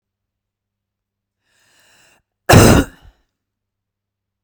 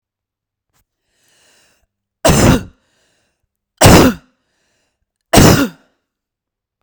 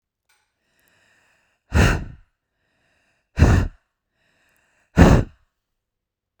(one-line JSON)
{"cough_length": "4.4 s", "cough_amplitude": 32768, "cough_signal_mean_std_ratio": 0.23, "three_cough_length": "6.8 s", "three_cough_amplitude": 32768, "three_cough_signal_mean_std_ratio": 0.32, "exhalation_length": "6.4 s", "exhalation_amplitude": 32768, "exhalation_signal_mean_std_ratio": 0.28, "survey_phase": "beta (2021-08-13 to 2022-03-07)", "age": "18-44", "gender": "Female", "wearing_mask": "No", "symptom_none": true, "smoker_status": "Never smoked", "respiratory_condition_asthma": false, "respiratory_condition_other": false, "recruitment_source": "REACT", "submission_delay": "2 days", "covid_test_result": "Negative", "covid_test_method": "RT-qPCR"}